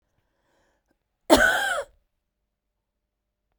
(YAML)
cough_length: 3.6 s
cough_amplitude: 30602
cough_signal_mean_std_ratio: 0.28
survey_phase: beta (2021-08-13 to 2022-03-07)
age: 45-64
gender: Female
wearing_mask: 'No'
symptom_cough_any: true
symptom_sore_throat: true
symptom_fatigue: true
symptom_headache: true
symptom_onset: 3 days
smoker_status: Ex-smoker
respiratory_condition_asthma: false
respiratory_condition_other: false
recruitment_source: Test and Trace
submission_delay: 1 day
covid_test_result: Positive
covid_test_method: RT-qPCR
covid_ct_value: 17.9
covid_ct_gene: N gene
covid_ct_mean: 18.8
covid_viral_load: 660000 copies/ml
covid_viral_load_category: Low viral load (10K-1M copies/ml)